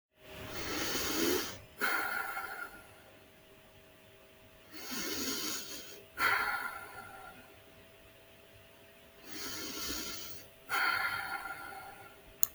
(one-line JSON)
{"exhalation_length": "12.5 s", "exhalation_amplitude": 26572, "exhalation_signal_mean_std_ratio": 0.6, "survey_phase": "beta (2021-08-13 to 2022-03-07)", "age": "45-64", "gender": "Female", "wearing_mask": "No", "symptom_none": true, "smoker_status": "Never smoked", "respiratory_condition_asthma": false, "respiratory_condition_other": false, "recruitment_source": "REACT", "submission_delay": "5 days", "covid_test_result": "Negative", "covid_test_method": "RT-qPCR", "influenza_a_test_result": "Negative", "influenza_b_test_result": "Negative"}